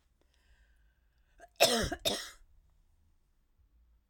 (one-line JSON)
{"cough_length": "4.1 s", "cough_amplitude": 9522, "cough_signal_mean_std_ratio": 0.27, "survey_phase": "alpha (2021-03-01 to 2021-08-12)", "age": "65+", "gender": "Female", "wearing_mask": "No", "symptom_none": true, "smoker_status": "Never smoked", "respiratory_condition_asthma": false, "respiratory_condition_other": false, "recruitment_source": "REACT", "submission_delay": "1 day", "covid_test_result": "Negative", "covid_test_method": "RT-qPCR"}